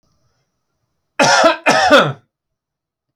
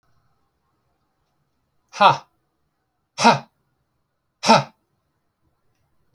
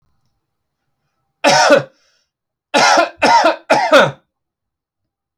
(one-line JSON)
{"cough_length": "3.2 s", "cough_amplitude": 32768, "cough_signal_mean_std_ratio": 0.42, "exhalation_length": "6.1 s", "exhalation_amplitude": 28119, "exhalation_signal_mean_std_ratio": 0.22, "three_cough_length": "5.4 s", "three_cough_amplitude": 32307, "three_cough_signal_mean_std_ratio": 0.44, "survey_phase": "alpha (2021-03-01 to 2021-08-12)", "age": "45-64", "gender": "Male", "wearing_mask": "No", "symptom_none": true, "smoker_status": "Never smoked", "respiratory_condition_asthma": false, "respiratory_condition_other": false, "recruitment_source": "REACT", "submission_delay": "5 days", "covid_test_result": "Negative", "covid_test_method": "RT-qPCR"}